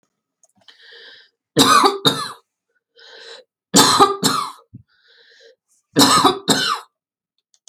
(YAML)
three_cough_length: 7.7 s
three_cough_amplitude: 32768
three_cough_signal_mean_std_ratio: 0.4
survey_phase: beta (2021-08-13 to 2022-03-07)
age: 45-64
gender: Female
wearing_mask: 'No'
symptom_none: true
smoker_status: Ex-smoker
respiratory_condition_asthma: false
respiratory_condition_other: false
recruitment_source: REACT
submission_delay: 3 days
covid_test_result: Negative
covid_test_method: RT-qPCR
influenza_a_test_result: Negative
influenza_b_test_result: Negative